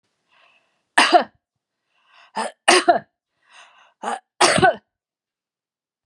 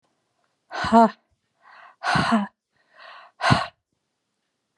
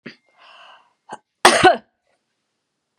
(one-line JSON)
{"three_cough_length": "6.1 s", "three_cough_amplitude": 32610, "three_cough_signal_mean_std_ratio": 0.31, "exhalation_length": "4.8 s", "exhalation_amplitude": 26584, "exhalation_signal_mean_std_ratio": 0.33, "cough_length": "3.0 s", "cough_amplitude": 32768, "cough_signal_mean_std_ratio": 0.25, "survey_phase": "beta (2021-08-13 to 2022-03-07)", "age": "65+", "gender": "Female", "wearing_mask": "No", "symptom_none": true, "smoker_status": "Never smoked", "respiratory_condition_asthma": false, "respiratory_condition_other": false, "recruitment_source": "REACT", "submission_delay": "2 days", "covid_test_result": "Negative", "covid_test_method": "RT-qPCR"}